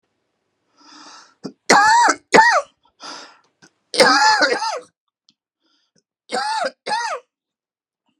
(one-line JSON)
{"three_cough_length": "8.2 s", "three_cough_amplitude": 32768, "three_cough_signal_mean_std_ratio": 0.41, "survey_phase": "beta (2021-08-13 to 2022-03-07)", "age": "65+", "gender": "Male", "wearing_mask": "No", "symptom_cough_any": true, "symptom_sore_throat": true, "symptom_fatigue": true, "symptom_onset": "12 days", "smoker_status": "Never smoked", "respiratory_condition_asthma": false, "respiratory_condition_other": false, "recruitment_source": "REACT", "submission_delay": "5 days", "covid_test_result": "Negative", "covid_test_method": "RT-qPCR"}